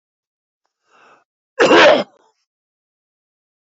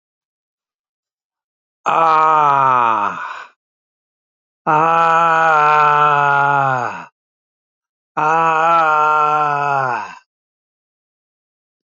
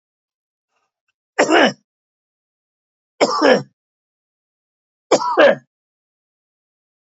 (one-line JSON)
{"cough_length": "3.8 s", "cough_amplitude": 30979, "cough_signal_mean_std_ratio": 0.28, "exhalation_length": "11.9 s", "exhalation_amplitude": 28926, "exhalation_signal_mean_std_ratio": 0.59, "three_cough_length": "7.2 s", "three_cough_amplitude": 29941, "three_cough_signal_mean_std_ratio": 0.3, "survey_phase": "alpha (2021-03-01 to 2021-08-12)", "age": "65+", "gender": "Male", "wearing_mask": "No", "symptom_change_to_sense_of_smell_or_taste": true, "symptom_onset": "8 days", "smoker_status": "Ex-smoker", "respiratory_condition_asthma": false, "respiratory_condition_other": true, "recruitment_source": "Test and Trace", "submission_delay": "2 days", "covid_test_result": "Positive", "covid_test_method": "RT-qPCR", "covid_ct_value": 29.1, "covid_ct_gene": "ORF1ab gene", "covid_ct_mean": 29.6, "covid_viral_load": "200 copies/ml", "covid_viral_load_category": "Minimal viral load (< 10K copies/ml)"}